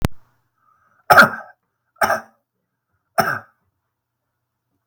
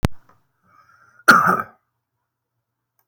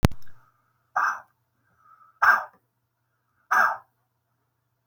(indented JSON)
{
  "three_cough_length": "4.9 s",
  "three_cough_amplitude": 32768,
  "three_cough_signal_mean_std_ratio": 0.26,
  "cough_length": "3.1 s",
  "cough_amplitude": 32768,
  "cough_signal_mean_std_ratio": 0.28,
  "exhalation_length": "4.9 s",
  "exhalation_amplitude": 32766,
  "exhalation_signal_mean_std_ratio": 0.33,
  "survey_phase": "beta (2021-08-13 to 2022-03-07)",
  "age": "45-64",
  "gender": "Male",
  "wearing_mask": "No",
  "symptom_none": true,
  "smoker_status": "Never smoked",
  "respiratory_condition_asthma": true,
  "respiratory_condition_other": false,
  "recruitment_source": "REACT",
  "submission_delay": "2 days",
  "covid_test_result": "Negative",
  "covid_test_method": "RT-qPCR",
  "covid_ct_value": 37.7,
  "covid_ct_gene": "N gene",
  "influenza_a_test_result": "Negative",
  "influenza_b_test_result": "Negative"
}